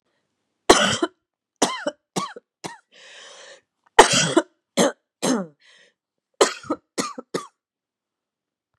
{
  "cough_length": "8.8 s",
  "cough_amplitude": 32768,
  "cough_signal_mean_std_ratio": 0.3,
  "survey_phase": "beta (2021-08-13 to 2022-03-07)",
  "age": "45-64",
  "gender": "Female",
  "wearing_mask": "No",
  "symptom_cough_any": true,
  "symptom_runny_or_blocked_nose": true,
  "symptom_onset": "12 days",
  "smoker_status": "Never smoked",
  "respiratory_condition_asthma": false,
  "respiratory_condition_other": false,
  "recruitment_source": "REACT",
  "submission_delay": "2 days",
  "covid_test_result": "Negative",
  "covid_test_method": "RT-qPCR",
  "influenza_a_test_result": "Negative",
  "influenza_b_test_result": "Negative"
}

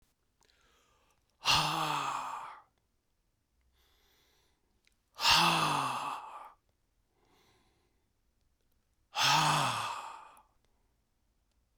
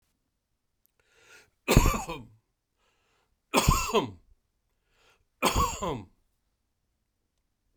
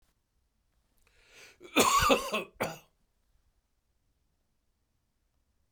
{
  "exhalation_length": "11.8 s",
  "exhalation_amplitude": 9589,
  "exhalation_signal_mean_std_ratio": 0.39,
  "three_cough_length": "7.8 s",
  "three_cough_amplitude": 23124,
  "three_cough_signal_mean_std_ratio": 0.3,
  "cough_length": "5.7 s",
  "cough_amplitude": 12971,
  "cough_signal_mean_std_ratio": 0.28,
  "survey_phase": "beta (2021-08-13 to 2022-03-07)",
  "age": "65+",
  "gender": "Male",
  "wearing_mask": "No",
  "symptom_none": true,
  "smoker_status": "Ex-smoker",
  "respiratory_condition_asthma": false,
  "respiratory_condition_other": false,
  "recruitment_source": "REACT",
  "submission_delay": "2 days",
  "covid_test_result": "Negative",
  "covid_test_method": "RT-qPCR",
  "influenza_a_test_result": "Unknown/Void",
  "influenza_b_test_result": "Unknown/Void"
}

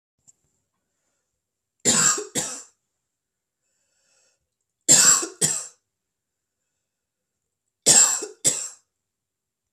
{
  "three_cough_length": "9.7 s",
  "three_cough_amplitude": 30319,
  "three_cough_signal_mean_std_ratio": 0.3,
  "survey_phase": "beta (2021-08-13 to 2022-03-07)",
  "age": "18-44",
  "gender": "Female",
  "wearing_mask": "No",
  "symptom_cough_any": true,
  "symptom_runny_or_blocked_nose": true,
  "symptom_sore_throat": true,
  "symptom_fatigue": true,
  "symptom_fever_high_temperature": true,
  "symptom_headache": true,
  "symptom_onset": "3 days",
  "smoker_status": "Never smoked",
  "respiratory_condition_asthma": false,
  "respiratory_condition_other": false,
  "recruitment_source": "Test and Trace",
  "submission_delay": "1 day",
  "covid_test_result": "Positive",
  "covid_test_method": "ePCR"
}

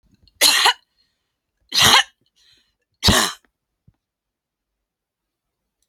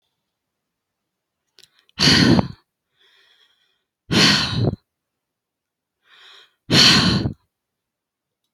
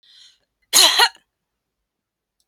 {
  "three_cough_length": "5.9 s",
  "three_cough_amplitude": 32768,
  "three_cough_signal_mean_std_ratio": 0.3,
  "exhalation_length": "8.5 s",
  "exhalation_amplitude": 31278,
  "exhalation_signal_mean_std_ratio": 0.35,
  "cough_length": "2.5 s",
  "cough_amplitude": 32768,
  "cough_signal_mean_std_ratio": 0.29,
  "survey_phase": "beta (2021-08-13 to 2022-03-07)",
  "age": "18-44",
  "gender": "Female",
  "wearing_mask": "No",
  "symptom_cough_any": true,
  "symptom_runny_or_blocked_nose": true,
  "symptom_sore_throat": true,
  "symptom_headache": true,
  "symptom_onset": "4 days",
  "smoker_status": "Never smoked",
  "respiratory_condition_asthma": false,
  "respiratory_condition_other": false,
  "recruitment_source": "REACT",
  "submission_delay": "1 day",
  "covid_test_result": "Negative",
  "covid_test_method": "RT-qPCR"
}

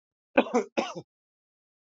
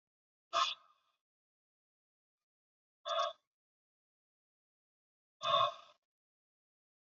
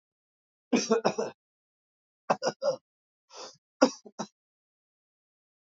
{
  "cough_length": "1.9 s",
  "cough_amplitude": 17570,
  "cough_signal_mean_std_ratio": 0.29,
  "exhalation_length": "7.2 s",
  "exhalation_amplitude": 4167,
  "exhalation_signal_mean_std_ratio": 0.25,
  "three_cough_length": "5.6 s",
  "three_cough_amplitude": 17493,
  "three_cough_signal_mean_std_ratio": 0.28,
  "survey_phase": "alpha (2021-03-01 to 2021-08-12)",
  "age": "45-64",
  "gender": "Male",
  "wearing_mask": "No",
  "symptom_none": true,
  "smoker_status": "Never smoked",
  "respiratory_condition_asthma": false,
  "respiratory_condition_other": false,
  "recruitment_source": "REACT",
  "submission_delay": "2 days",
  "covid_test_result": "Negative",
  "covid_test_method": "RT-qPCR"
}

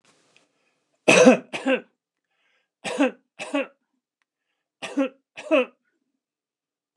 {
  "cough_length": "7.0 s",
  "cough_amplitude": 29203,
  "cough_signal_mean_std_ratio": 0.29,
  "survey_phase": "alpha (2021-03-01 to 2021-08-12)",
  "age": "65+",
  "gender": "Male",
  "wearing_mask": "No",
  "symptom_none": true,
  "smoker_status": "Ex-smoker",
  "respiratory_condition_asthma": false,
  "respiratory_condition_other": false,
  "recruitment_source": "REACT",
  "submission_delay": "1 day",
  "covid_test_result": "Negative",
  "covid_test_method": "RT-qPCR"
}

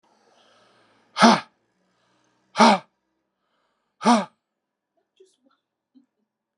{
  "exhalation_length": "6.6 s",
  "exhalation_amplitude": 29064,
  "exhalation_signal_mean_std_ratio": 0.23,
  "survey_phase": "beta (2021-08-13 to 2022-03-07)",
  "age": "65+",
  "gender": "Male",
  "wearing_mask": "No",
  "symptom_cough_any": true,
  "symptom_fatigue": true,
  "symptom_headache": true,
  "symptom_onset": "5 days",
  "smoker_status": "Ex-smoker",
  "respiratory_condition_asthma": true,
  "respiratory_condition_other": false,
  "recruitment_source": "Test and Trace",
  "submission_delay": "2 days",
  "covid_test_result": "Positive",
  "covid_test_method": "RT-qPCR",
  "covid_ct_value": 14.5,
  "covid_ct_gene": "ORF1ab gene",
  "covid_ct_mean": 15.0,
  "covid_viral_load": "12000000 copies/ml",
  "covid_viral_load_category": "High viral load (>1M copies/ml)"
}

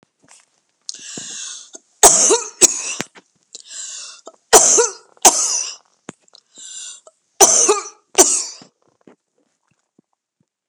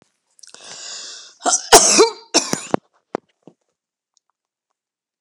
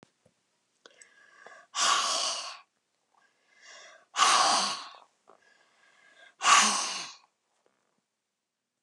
{
  "three_cough_length": "10.7 s",
  "three_cough_amplitude": 32768,
  "three_cough_signal_mean_std_ratio": 0.35,
  "cough_length": "5.2 s",
  "cough_amplitude": 32768,
  "cough_signal_mean_std_ratio": 0.29,
  "exhalation_length": "8.8 s",
  "exhalation_amplitude": 14438,
  "exhalation_signal_mean_std_ratio": 0.37,
  "survey_phase": "alpha (2021-03-01 to 2021-08-12)",
  "age": "65+",
  "gender": "Female",
  "wearing_mask": "No",
  "symptom_none": true,
  "smoker_status": "Never smoked",
  "respiratory_condition_asthma": false,
  "respiratory_condition_other": false,
  "recruitment_source": "REACT",
  "submission_delay": "2 days",
  "covid_test_result": "Negative",
  "covid_test_method": "RT-qPCR"
}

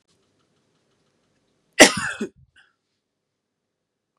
{
  "cough_length": "4.2 s",
  "cough_amplitude": 32768,
  "cough_signal_mean_std_ratio": 0.16,
  "survey_phase": "beta (2021-08-13 to 2022-03-07)",
  "age": "45-64",
  "gender": "Female",
  "wearing_mask": "No",
  "symptom_runny_or_blocked_nose": true,
  "symptom_sore_throat": true,
  "symptom_headache": true,
  "smoker_status": "Ex-smoker",
  "respiratory_condition_asthma": false,
  "respiratory_condition_other": false,
  "recruitment_source": "REACT",
  "submission_delay": "1 day",
  "covid_test_result": "Negative",
  "covid_test_method": "RT-qPCR",
  "influenza_a_test_result": "Negative",
  "influenza_b_test_result": "Negative"
}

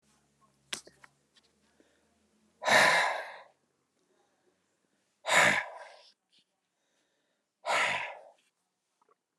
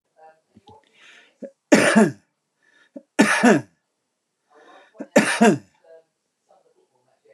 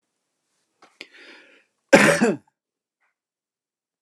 {
  "exhalation_length": "9.4 s",
  "exhalation_amplitude": 10444,
  "exhalation_signal_mean_std_ratio": 0.31,
  "three_cough_length": "7.3 s",
  "three_cough_amplitude": 29071,
  "three_cough_signal_mean_std_ratio": 0.32,
  "cough_length": "4.0 s",
  "cough_amplitude": 29204,
  "cough_signal_mean_std_ratio": 0.24,
  "survey_phase": "alpha (2021-03-01 to 2021-08-12)",
  "age": "65+",
  "gender": "Male",
  "wearing_mask": "No",
  "symptom_none": true,
  "smoker_status": "Never smoked",
  "respiratory_condition_asthma": false,
  "respiratory_condition_other": false,
  "recruitment_source": "REACT",
  "submission_delay": "1 day",
  "covid_test_result": "Negative",
  "covid_test_method": "RT-qPCR",
  "covid_ct_value": 41.0,
  "covid_ct_gene": "E gene"
}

